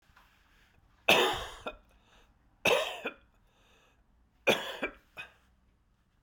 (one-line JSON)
{"three_cough_length": "6.2 s", "three_cough_amplitude": 12964, "three_cough_signal_mean_std_ratio": 0.32, "survey_phase": "beta (2021-08-13 to 2022-03-07)", "age": "45-64", "gender": "Male", "wearing_mask": "No", "symptom_cough_any": true, "symptom_new_continuous_cough": true, "symptom_runny_or_blocked_nose": true, "symptom_sore_throat": true, "symptom_fatigue": true, "symptom_fever_high_temperature": true, "symptom_headache": true, "symptom_change_to_sense_of_smell_or_taste": true, "symptom_loss_of_taste": true, "symptom_onset": "3 days", "smoker_status": "Never smoked", "respiratory_condition_asthma": false, "respiratory_condition_other": false, "recruitment_source": "Test and Trace", "submission_delay": "2 days", "covid_test_result": "Positive", "covid_test_method": "RT-qPCR", "covid_ct_value": 22.1, "covid_ct_gene": "ORF1ab gene", "covid_ct_mean": 22.8, "covid_viral_load": "33000 copies/ml", "covid_viral_load_category": "Low viral load (10K-1M copies/ml)"}